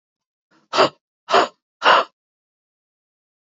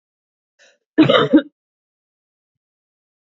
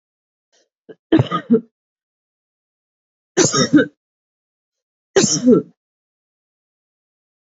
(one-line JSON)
{"exhalation_length": "3.6 s", "exhalation_amplitude": 28052, "exhalation_signal_mean_std_ratio": 0.29, "cough_length": "3.3 s", "cough_amplitude": 29163, "cough_signal_mean_std_ratio": 0.26, "three_cough_length": "7.4 s", "three_cough_amplitude": 32768, "three_cough_signal_mean_std_ratio": 0.31, "survey_phase": "beta (2021-08-13 to 2022-03-07)", "age": "18-44", "gender": "Female", "wearing_mask": "No", "symptom_none": true, "smoker_status": "Current smoker (1 to 10 cigarettes per day)", "respiratory_condition_asthma": false, "respiratory_condition_other": false, "recruitment_source": "REACT", "submission_delay": "5 days", "covid_test_result": "Negative", "covid_test_method": "RT-qPCR"}